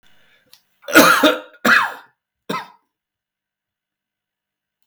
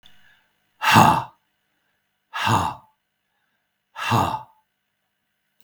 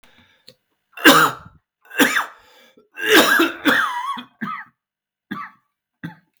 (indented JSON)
{
  "cough_length": "4.9 s",
  "cough_amplitude": 32768,
  "cough_signal_mean_std_ratio": 0.31,
  "exhalation_length": "5.6 s",
  "exhalation_amplitude": 32766,
  "exhalation_signal_mean_std_ratio": 0.33,
  "three_cough_length": "6.4 s",
  "three_cough_amplitude": 32768,
  "three_cough_signal_mean_std_ratio": 0.4,
  "survey_phase": "beta (2021-08-13 to 2022-03-07)",
  "age": "45-64",
  "gender": "Male",
  "wearing_mask": "No",
  "symptom_cough_any": true,
  "symptom_runny_or_blocked_nose": true,
  "symptom_sore_throat": true,
  "symptom_abdominal_pain": true,
  "symptom_diarrhoea": true,
  "symptom_fatigue": true,
  "symptom_fever_high_temperature": true,
  "symptom_headache": true,
  "smoker_status": "Ex-smoker",
  "respiratory_condition_asthma": false,
  "respiratory_condition_other": false,
  "recruitment_source": "Test and Trace",
  "submission_delay": "3 days",
  "covid_test_result": "Positive",
  "covid_test_method": "ePCR"
}